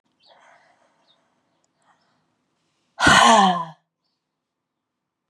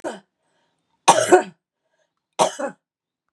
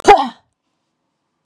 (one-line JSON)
{"exhalation_length": "5.3 s", "exhalation_amplitude": 28981, "exhalation_signal_mean_std_ratio": 0.27, "three_cough_length": "3.3 s", "three_cough_amplitude": 32768, "three_cough_signal_mean_std_ratio": 0.29, "cough_length": "1.5 s", "cough_amplitude": 32768, "cough_signal_mean_std_ratio": 0.28, "survey_phase": "beta (2021-08-13 to 2022-03-07)", "age": "45-64", "gender": "Female", "wearing_mask": "No", "symptom_cough_any": true, "symptom_fatigue": true, "smoker_status": "Never smoked", "respiratory_condition_asthma": false, "respiratory_condition_other": false, "recruitment_source": "Test and Trace", "submission_delay": "3 days", "covid_test_result": "Positive", "covid_test_method": "LFT"}